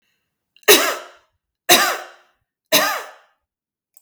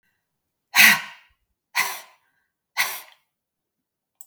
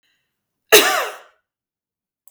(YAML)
three_cough_length: 4.0 s
three_cough_amplitude: 32768
three_cough_signal_mean_std_ratio: 0.34
exhalation_length: 4.3 s
exhalation_amplitude: 32538
exhalation_signal_mean_std_ratio: 0.26
cough_length: 2.3 s
cough_amplitude: 32768
cough_signal_mean_std_ratio: 0.28
survey_phase: beta (2021-08-13 to 2022-03-07)
age: 45-64
gender: Female
wearing_mask: 'No'
symptom_none: true
smoker_status: Never smoked
respiratory_condition_asthma: false
respiratory_condition_other: false
recruitment_source: REACT
submission_delay: 2 days
covid_test_result: Negative
covid_test_method: RT-qPCR